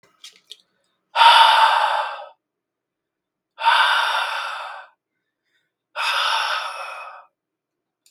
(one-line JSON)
{"exhalation_length": "8.1 s", "exhalation_amplitude": 32713, "exhalation_signal_mean_std_ratio": 0.45, "survey_phase": "beta (2021-08-13 to 2022-03-07)", "age": "18-44", "gender": "Male", "wearing_mask": "No", "symptom_cough_any": true, "symptom_new_continuous_cough": true, "symptom_runny_or_blocked_nose": true, "symptom_sore_throat": true, "symptom_fatigue": true, "symptom_fever_high_temperature": true, "symptom_headache": true, "symptom_other": true, "symptom_onset": "3 days", "smoker_status": "Never smoked", "respiratory_condition_asthma": false, "respiratory_condition_other": false, "recruitment_source": "Test and Trace", "submission_delay": "1 day", "covid_test_result": "Positive", "covid_test_method": "RT-qPCR", "covid_ct_value": 24.8, "covid_ct_gene": "N gene", "covid_ct_mean": 24.8, "covid_viral_load": "7100 copies/ml", "covid_viral_load_category": "Minimal viral load (< 10K copies/ml)"}